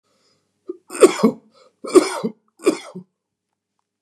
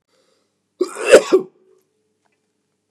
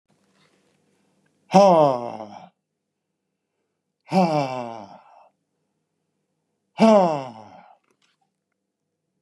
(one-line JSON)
{"three_cough_length": "4.0 s", "three_cough_amplitude": 32768, "three_cough_signal_mean_std_ratio": 0.28, "cough_length": "2.9 s", "cough_amplitude": 32768, "cough_signal_mean_std_ratio": 0.25, "exhalation_length": "9.2 s", "exhalation_amplitude": 28265, "exhalation_signal_mean_std_ratio": 0.3, "survey_phase": "beta (2021-08-13 to 2022-03-07)", "age": "45-64", "gender": "Male", "wearing_mask": "No", "symptom_none": true, "smoker_status": "Never smoked", "respiratory_condition_asthma": true, "respiratory_condition_other": false, "recruitment_source": "REACT", "submission_delay": "1 day", "covid_test_result": "Negative", "covid_test_method": "RT-qPCR"}